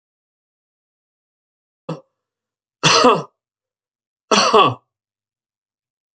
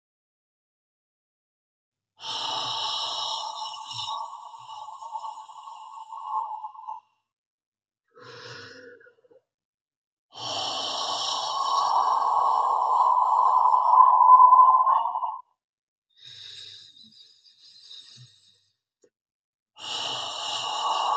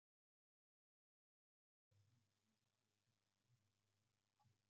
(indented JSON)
{
  "three_cough_length": "6.1 s",
  "three_cough_amplitude": 30550,
  "three_cough_signal_mean_std_ratio": 0.29,
  "exhalation_length": "21.2 s",
  "exhalation_amplitude": 21022,
  "exhalation_signal_mean_std_ratio": 0.47,
  "cough_length": "4.7 s",
  "cough_amplitude": 11,
  "cough_signal_mean_std_ratio": 0.47,
  "survey_phase": "beta (2021-08-13 to 2022-03-07)",
  "age": "65+",
  "gender": "Male",
  "wearing_mask": "No",
  "symptom_none": true,
  "smoker_status": "Current smoker (1 to 10 cigarettes per day)",
  "respiratory_condition_asthma": false,
  "respiratory_condition_other": false,
  "recruitment_source": "REACT",
  "submission_delay": "3 days",
  "covid_test_result": "Negative",
  "covid_test_method": "RT-qPCR",
  "influenza_a_test_result": "Negative",
  "influenza_b_test_result": "Negative"
}